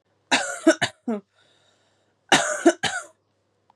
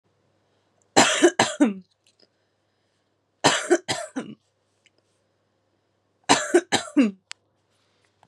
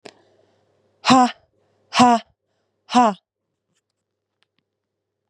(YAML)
cough_length: 3.8 s
cough_amplitude: 25785
cough_signal_mean_std_ratio: 0.36
three_cough_length: 8.3 s
three_cough_amplitude: 32760
three_cough_signal_mean_std_ratio: 0.32
exhalation_length: 5.3 s
exhalation_amplitude: 32470
exhalation_signal_mean_std_ratio: 0.28
survey_phase: beta (2021-08-13 to 2022-03-07)
age: 18-44
gender: Female
wearing_mask: 'No'
symptom_runny_or_blocked_nose: true
symptom_fatigue: true
symptom_headache: true
symptom_change_to_sense_of_smell_or_taste: true
symptom_onset: 3 days
smoker_status: Never smoked
respiratory_condition_asthma: false
respiratory_condition_other: false
recruitment_source: Test and Trace
submission_delay: 2 days
covid_test_result: Positive
covid_test_method: RT-qPCR
covid_ct_value: 31.8
covid_ct_gene: N gene
covid_ct_mean: 32.2
covid_viral_load: 27 copies/ml
covid_viral_load_category: Minimal viral load (< 10K copies/ml)